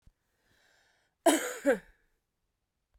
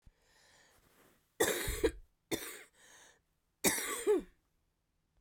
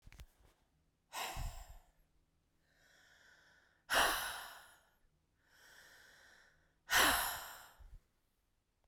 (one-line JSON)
{"cough_length": "3.0 s", "cough_amplitude": 10902, "cough_signal_mean_std_ratio": 0.26, "three_cough_length": "5.2 s", "three_cough_amplitude": 5700, "three_cough_signal_mean_std_ratio": 0.38, "exhalation_length": "8.9 s", "exhalation_amplitude": 4580, "exhalation_signal_mean_std_ratio": 0.33, "survey_phase": "beta (2021-08-13 to 2022-03-07)", "age": "45-64", "gender": "Female", "wearing_mask": "No", "symptom_new_continuous_cough": true, "symptom_runny_or_blocked_nose": true, "symptom_shortness_of_breath": true, "symptom_sore_throat": true, "symptom_fatigue": true, "symptom_other": true, "symptom_onset": "2 days", "smoker_status": "Never smoked", "respiratory_condition_asthma": false, "respiratory_condition_other": false, "recruitment_source": "Test and Trace", "submission_delay": "1 day", "covid_test_result": "Positive", "covid_test_method": "RT-qPCR", "covid_ct_value": 17.6, "covid_ct_gene": "ORF1ab gene", "covid_ct_mean": 18.0, "covid_viral_load": "1200000 copies/ml", "covid_viral_load_category": "High viral load (>1M copies/ml)"}